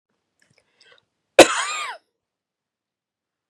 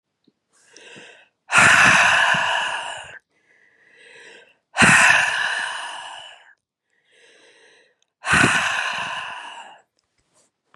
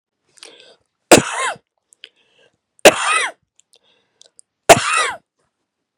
cough_length: 3.5 s
cough_amplitude: 32768
cough_signal_mean_std_ratio: 0.18
exhalation_length: 10.8 s
exhalation_amplitude: 32071
exhalation_signal_mean_std_ratio: 0.45
three_cough_length: 6.0 s
three_cough_amplitude: 32768
three_cough_signal_mean_std_ratio: 0.28
survey_phase: beta (2021-08-13 to 2022-03-07)
age: 18-44
gender: Female
wearing_mask: 'No'
symptom_runny_or_blocked_nose: true
symptom_sore_throat: true
symptom_fatigue: true
symptom_headache: true
smoker_status: Never smoked
respiratory_condition_asthma: false
respiratory_condition_other: false
recruitment_source: Test and Trace
submission_delay: 2 days
covid_test_result: Positive
covid_test_method: RT-qPCR
covid_ct_value: 26.7
covid_ct_gene: ORF1ab gene
covid_ct_mean: 27.2
covid_viral_load: 1200 copies/ml
covid_viral_load_category: Minimal viral load (< 10K copies/ml)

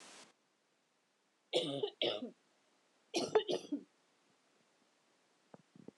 cough_length: 6.0 s
cough_amplitude: 3722
cough_signal_mean_std_ratio: 0.33
survey_phase: alpha (2021-03-01 to 2021-08-12)
age: 18-44
gender: Female
wearing_mask: 'No'
symptom_cough_any: true
symptom_fatigue: true
symptom_headache: true
symptom_change_to_sense_of_smell_or_taste: true
symptom_onset: 3 days
smoker_status: Never smoked
respiratory_condition_asthma: false
respiratory_condition_other: false
recruitment_source: Test and Trace
submission_delay: 2 days
covid_test_result: Positive
covid_test_method: RT-qPCR
covid_ct_value: 20.3
covid_ct_gene: ORF1ab gene
covid_ct_mean: 20.5
covid_viral_load: 200000 copies/ml
covid_viral_load_category: Low viral load (10K-1M copies/ml)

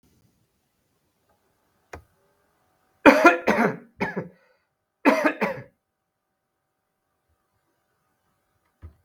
cough_length: 9.0 s
cough_amplitude: 32768
cough_signal_mean_std_ratio: 0.24
survey_phase: beta (2021-08-13 to 2022-03-07)
age: 65+
gender: Male
wearing_mask: 'No'
symptom_cough_any: true
symptom_runny_or_blocked_nose: true
smoker_status: Never smoked
respiratory_condition_asthma: false
respiratory_condition_other: false
recruitment_source: Test and Trace
submission_delay: 1 day
covid_test_result: Positive
covid_test_method: RT-qPCR
covid_ct_value: 19.6
covid_ct_gene: ORF1ab gene
covid_ct_mean: 20.1
covid_viral_load: 250000 copies/ml
covid_viral_load_category: Low viral load (10K-1M copies/ml)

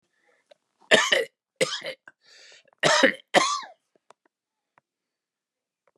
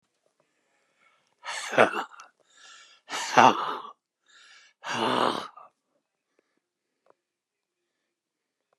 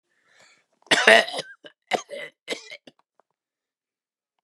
three_cough_length: 6.0 s
three_cough_amplitude: 24428
three_cough_signal_mean_std_ratio: 0.31
exhalation_length: 8.8 s
exhalation_amplitude: 23934
exhalation_signal_mean_std_ratio: 0.27
cough_length: 4.4 s
cough_amplitude: 32768
cough_signal_mean_std_ratio: 0.25
survey_phase: beta (2021-08-13 to 2022-03-07)
age: 65+
gender: Male
wearing_mask: 'No'
symptom_cough_any: true
symptom_runny_or_blocked_nose: true
symptom_sore_throat: true
symptom_abdominal_pain: true
symptom_fatigue: true
smoker_status: Never smoked
respiratory_condition_asthma: false
respiratory_condition_other: false
recruitment_source: Test and Trace
submission_delay: 2 days
covid_test_result: Positive
covid_test_method: RT-qPCR
covid_ct_value: 20.1
covid_ct_gene: N gene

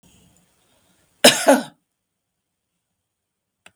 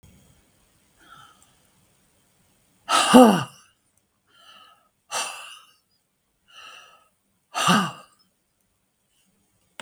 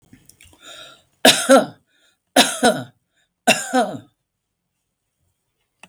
cough_length: 3.8 s
cough_amplitude: 32768
cough_signal_mean_std_ratio: 0.21
exhalation_length: 9.8 s
exhalation_amplitude: 32768
exhalation_signal_mean_std_ratio: 0.23
three_cough_length: 5.9 s
three_cough_amplitude: 32768
three_cough_signal_mean_std_ratio: 0.31
survey_phase: beta (2021-08-13 to 2022-03-07)
age: 65+
gender: Female
wearing_mask: 'No'
symptom_none: true
smoker_status: Ex-smoker
respiratory_condition_asthma: false
respiratory_condition_other: false
recruitment_source: REACT
submission_delay: 2 days
covid_test_result: Negative
covid_test_method: RT-qPCR
influenza_a_test_result: Negative
influenza_b_test_result: Negative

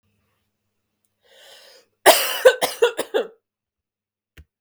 cough_length: 4.6 s
cough_amplitude: 32768
cough_signal_mean_std_ratio: 0.28
survey_phase: beta (2021-08-13 to 2022-03-07)
age: 45-64
gender: Female
wearing_mask: 'No'
symptom_cough_any: true
symptom_new_continuous_cough: true
symptom_runny_or_blocked_nose: true
symptom_shortness_of_breath: true
symptom_sore_throat: true
symptom_fatigue: true
symptom_headache: true
symptom_change_to_sense_of_smell_or_taste: true
symptom_onset: 5 days
smoker_status: Never smoked
respiratory_condition_asthma: true
respiratory_condition_other: false
recruitment_source: Test and Trace
submission_delay: 2 days
covid_test_result: Positive
covid_test_method: RT-qPCR
covid_ct_value: 24.3
covid_ct_gene: ORF1ab gene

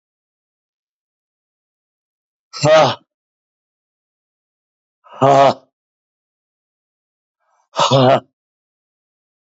exhalation_length: 9.5 s
exhalation_amplitude: 28592
exhalation_signal_mean_std_ratio: 0.27
survey_phase: beta (2021-08-13 to 2022-03-07)
age: 45-64
gender: Male
wearing_mask: 'No'
symptom_none: true
smoker_status: Never smoked
respiratory_condition_asthma: false
respiratory_condition_other: false
recruitment_source: REACT
submission_delay: 1 day
covid_test_result: Negative
covid_test_method: RT-qPCR
influenza_a_test_result: Negative
influenza_b_test_result: Negative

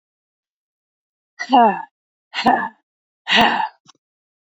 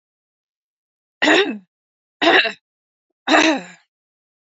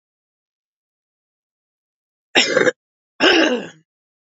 exhalation_length: 4.4 s
exhalation_amplitude: 27524
exhalation_signal_mean_std_ratio: 0.36
three_cough_length: 4.4 s
three_cough_amplitude: 28594
three_cough_signal_mean_std_ratio: 0.36
cough_length: 4.4 s
cough_amplitude: 31290
cough_signal_mean_std_ratio: 0.32
survey_phase: beta (2021-08-13 to 2022-03-07)
age: 18-44
gender: Female
wearing_mask: 'No'
symptom_cough_any: true
symptom_runny_or_blocked_nose: true
symptom_shortness_of_breath: true
symptom_sore_throat: true
symptom_fatigue: true
symptom_headache: true
symptom_other: true
smoker_status: Never smoked
respiratory_condition_asthma: false
respiratory_condition_other: false
recruitment_source: Test and Trace
submission_delay: 1 day
covid_test_result: Positive
covid_test_method: ePCR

